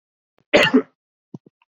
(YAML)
cough_length: 1.7 s
cough_amplitude: 28506
cough_signal_mean_std_ratio: 0.31
survey_phase: beta (2021-08-13 to 2022-03-07)
age: 18-44
gender: Male
wearing_mask: 'No'
symptom_none: true
smoker_status: Never smoked
respiratory_condition_asthma: false
respiratory_condition_other: false
recruitment_source: REACT
submission_delay: 1 day
covid_test_result: Negative
covid_test_method: RT-qPCR
influenza_a_test_result: Negative
influenza_b_test_result: Negative